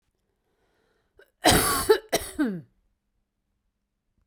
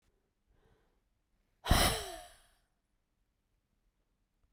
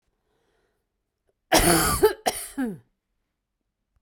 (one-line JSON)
{"cough_length": "4.3 s", "cough_amplitude": 21316, "cough_signal_mean_std_ratio": 0.33, "exhalation_length": "4.5 s", "exhalation_amplitude": 6685, "exhalation_signal_mean_std_ratio": 0.23, "three_cough_length": "4.0 s", "three_cough_amplitude": 24143, "three_cough_signal_mean_std_ratio": 0.36, "survey_phase": "beta (2021-08-13 to 2022-03-07)", "age": "45-64", "gender": "Female", "wearing_mask": "No", "symptom_cough_any": true, "symptom_runny_or_blocked_nose": true, "symptom_sore_throat": true, "symptom_abdominal_pain": true, "symptom_diarrhoea": true, "symptom_fatigue": true, "symptom_fever_high_temperature": true, "symptom_headache": true, "symptom_change_to_sense_of_smell_or_taste": true, "symptom_onset": "3 days", "smoker_status": "Ex-smoker", "respiratory_condition_asthma": true, "respiratory_condition_other": false, "recruitment_source": "Test and Trace", "submission_delay": "1 day", "covid_test_result": "Positive", "covid_test_method": "RT-qPCR", "covid_ct_value": 22.5, "covid_ct_gene": "ORF1ab gene", "covid_ct_mean": 22.8, "covid_viral_load": "34000 copies/ml", "covid_viral_load_category": "Low viral load (10K-1M copies/ml)"}